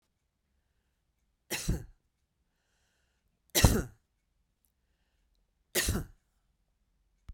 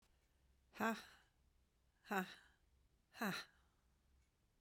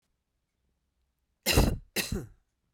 {
  "three_cough_length": "7.3 s",
  "three_cough_amplitude": 16758,
  "three_cough_signal_mean_std_ratio": 0.23,
  "exhalation_length": "4.6 s",
  "exhalation_amplitude": 1297,
  "exhalation_signal_mean_std_ratio": 0.32,
  "cough_length": "2.7 s",
  "cough_amplitude": 12908,
  "cough_signal_mean_std_ratio": 0.32,
  "survey_phase": "beta (2021-08-13 to 2022-03-07)",
  "age": "45-64",
  "gender": "Female",
  "wearing_mask": "No",
  "symptom_cough_any": true,
  "symptom_runny_or_blocked_nose": true,
  "symptom_sore_throat": true,
  "symptom_onset": "6 days",
  "smoker_status": "Ex-smoker",
  "respiratory_condition_asthma": false,
  "respiratory_condition_other": false,
  "recruitment_source": "REACT",
  "submission_delay": "1 day",
  "covid_test_result": "Negative",
  "covid_test_method": "RT-qPCR",
  "influenza_a_test_result": "Unknown/Void",
  "influenza_b_test_result": "Unknown/Void"
}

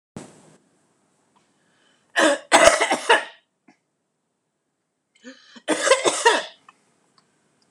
{
  "cough_length": "7.7 s",
  "cough_amplitude": 26028,
  "cough_signal_mean_std_ratio": 0.33,
  "survey_phase": "alpha (2021-03-01 to 2021-08-12)",
  "age": "65+",
  "gender": "Female",
  "wearing_mask": "No",
  "symptom_none": true,
  "smoker_status": "Ex-smoker",
  "respiratory_condition_asthma": true,
  "respiratory_condition_other": false,
  "recruitment_source": "REACT",
  "submission_delay": "1 day",
  "covid_test_result": "Negative",
  "covid_test_method": "RT-qPCR"
}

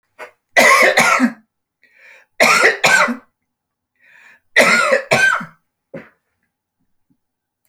{
  "three_cough_length": "7.7 s",
  "three_cough_amplitude": 32553,
  "three_cough_signal_mean_std_ratio": 0.45,
  "survey_phase": "beta (2021-08-13 to 2022-03-07)",
  "age": "65+",
  "gender": "Male",
  "wearing_mask": "No",
  "symptom_none": true,
  "smoker_status": "Never smoked",
  "respiratory_condition_asthma": false,
  "respiratory_condition_other": false,
  "recruitment_source": "REACT",
  "submission_delay": "2 days",
  "covid_test_result": "Negative",
  "covid_test_method": "RT-qPCR"
}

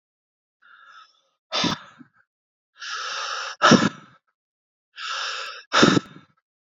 {
  "exhalation_length": "6.7 s",
  "exhalation_amplitude": 26512,
  "exhalation_signal_mean_std_ratio": 0.34,
  "survey_phase": "beta (2021-08-13 to 2022-03-07)",
  "age": "18-44",
  "gender": "Male",
  "wearing_mask": "No",
  "symptom_cough_any": true,
  "symptom_shortness_of_breath": true,
  "symptom_sore_throat": true,
  "symptom_fatigue": true,
  "symptom_headache": true,
  "symptom_change_to_sense_of_smell_or_taste": true,
  "symptom_onset": "4 days",
  "smoker_status": "Current smoker (1 to 10 cigarettes per day)",
  "respiratory_condition_asthma": false,
  "respiratory_condition_other": false,
  "recruitment_source": "Test and Trace",
  "submission_delay": "2 days",
  "covid_test_result": "Positive",
  "covid_test_method": "RT-qPCR",
  "covid_ct_value": 22.4,
  "covid_ct_gene": "N gene"
}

